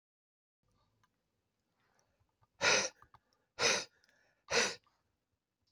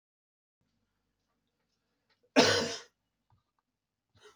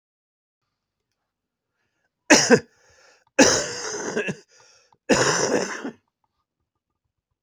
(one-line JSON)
{"exhalation_length": "5.7 s", "exhalation_amplitude": 4817, "exhalation_signal_mean_std_ratio": 0.28, "cough_length": "4.4 s", "cough_amplitude": 13437, "cough_signal_mean_std_ratio": 0.21, "three_cough_length": "7.4 s", "three_cough_amplitude": 31116, "three_cough_signal_mean_std_ratio": 0.33, "survey_phase": "beta (2021-08-13 to 2022-03-07)", "age": "65+", "gender": "Male", "wearing_mask": "No", "symptom_cough_any": true, "symptom_shortness_of_breath": true, "symptom_sore_throat": true, "symptom_abdominal_pain": true, "symptom_fatigue": true, "symptom_headache": true, "symptom_onset": "5 days", "smoker_status": "Ex-smoker", "respiratory_condition_asthma": false, "respiratory_condition_other": false, "recruitment_source": "Test and Trace", "submission_delay": "2 days", "covid_test_result": "Positive", "covid_test_method": "RT-qPCR", "covid_ct_value": 18.8, "covid_ct_gene": "N gene", "covid_ct_mean": 19.9, "covid_viral_load": "300000 copies/ml", "covid_viral_load_category": "Low viral load (10K-1M copies/ml)"}